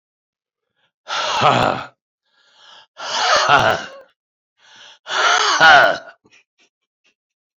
{"exhalation_length": "7.6 s", "exhalation_amplitude": 32767, "exhalation_signal_mean_std_ratio": 0.43, "survey_phase": "alpha (2021-03-01 to 2021-08-12)", "age": "65+", "gender": "Male", "wearing_mask": "No", "symptom_cough_any": true, "symptom_fatigue": true, "symptom_headache": true, "symptom_onset": "2 days", "smoker_status": "Ex-smoker", "respiratory_condition_asthma": false, "respiratory_condition_other": false, "recruitment_source": "Test and Trace", "submission_delay": "1 day", "covid_test_result": "Positive", "covid_test_method": "RT-qPCR", "covid_ct_value": 17.4, "covid_ct_gene": "ORF1ab gene", "covid_ct_mean": 18.3, "covid_viral_load": "1000000 copies/ml", "covid_viral_load_category": "High viral load (>1M copies/ml)"}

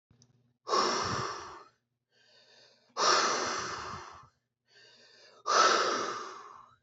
{"exhalation_length": "6.8 s", "exhalation_amplitude": 8967, "exhalation_signal_mean_std_ratio": 0.49, "survey_phase": "beta (2021-08-13 to 2022-03-07)", "age": "45-64", "gender": "Male", "wearing_mask": "No", "symptom_none": true, "smoker_status": "Ex-smoker", "respiratory_condition_asthma": false, "respiratory_condition_other": false, "recruitment_source": "REACT", "submission_delay": "3 days", "covid_test_result": "Negative", "covid_test_method": "RT-qPCR"}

